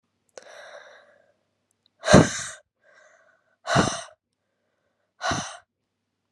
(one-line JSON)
{"exhalation_length": "6.3 s", "exhalation_amplitude": 32767, "exhalation_signal_mean_std_ratio": 0.25, "survey_phase": "beta (2021-08-13 to 2022-03-07)", "age": "18-44", "gender": "Female", "wearing_mask": "No", "symptom_cough_any": true, "symptom_runny_or_blocked_nose": true, "symptom_sore_throat": true, "symptom_fatigue": true, "symptom_fever_high_temperature": true, "symptom_headache": true, "symptom_change_to_sense_of_smell_or_taste": true, "symptom_loss_of_taste": true, "symptom_onset": "6 days", "smoker_status": "Never smoked", "respiratory_condition_asthma": false, "respiratory_condition_other": false, "recruitment_source": "Test and Trace", "submission_delay": "2 days", "covid_test_method": "RT-qPCR", "covid_ct_value": 22.6, "covid_ct_gene": "ORF1ab gene"}